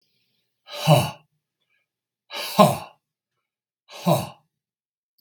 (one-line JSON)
{"exhalation_length": "5.2 s", "exhalation_amplitude": 32768, "exhalation_signal_mean_std_ratio": 0.28, "survey_phase": "beta (2021-08-13 to 2022-03-07)", "age": "45-64", "gender": "Male", "wearing_mask": "No", "symptom_none": true, "smoker_status": "Never smoked", "respiratory_condition_asthma": false, "respiratory_condition_other": false, "recruitment_source": "REACT", "submission_delay": "2 days", "covid_test_result": "Negative", "covid_test_method": "RT-qPCR", "influenza_a_test_result": "Unknown/Void", "influenza_b_test_result": "Unknown/Void"}